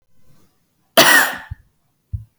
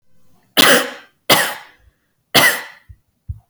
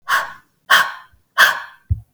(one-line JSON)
{"cough_length": "2.4 s", "cough_amplitude": 32768, "cough_signal_mean_std_ratio": 0.33, "three_cough_length": "3.5 s", "three_cough_amplitude": 32768, "three_cough_signal_mean_std_ratio": 0.39, "exhalation_length": "2.1 s", "exhalation_amplitude": 32768, "exhalation_signal_mean_std_ratio": 0.43, "survey_phase": "beta (2021-08-13 to 2022-03-07)", "age": "18-44", "gender": "Female", "wearing_mask": "No", "symptom_fatigue": true, "symptom_change_to_sense_of_smell_or_taste": true, "symptom_onset": "12 days", "smoker_status": "Never smoked", "respiratory_condition_asthma": true, "respiratory_condition_other": false, "recruitment_source": "REACT", "submission_delay": "1 day", "covid_test_result": "Negative", "covid_test_method": "RT-qPCR", "influenza_a_test_result": "Negative", "influenza_b_test_result": "Negative"}